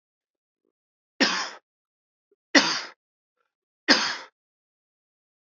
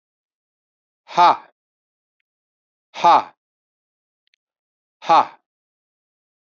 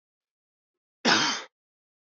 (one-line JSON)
{"three_cough_length": "5.5 s", "three_cough_amplitude": 28626, "three_cough_signal_mean_std_ratio": 0.26, "exhalation_length": "6.5 s", "exhalation_amplitude": 28799, "exhalation_signal_mean_std_ratio": 0.23, "cough_length": "2.1 s", "cough_amplitude": 13665, "cough_signal_mean_std_ratio": 0.31, "survey_phase": "beta (2021-08-13 to 2022-03-07)", "age": "18-44", "gender": "Male", "wearing_mask": "No", "symptom_cough_any": true, "symptom_runny_or_blocked_nose": true, "smoker_status": "Never smoked", "respiratory_condition_asthma": false, "respiratory_condition_other": false, "recruitment_source": "Test and Trace", "submission_delay": "1 day", "covid_test_result": "Positive", "covid_test_method": "RT-qPCR", "covid_ct_value": 24.4, "covid_ct_gene": "ORF1ab gene", "covid_ct_mean": 25.4, "covid_viral_load": "4800 copies/ml", "covid_viral_load_category": "Minimal viral load (< 10K copies/ml)"}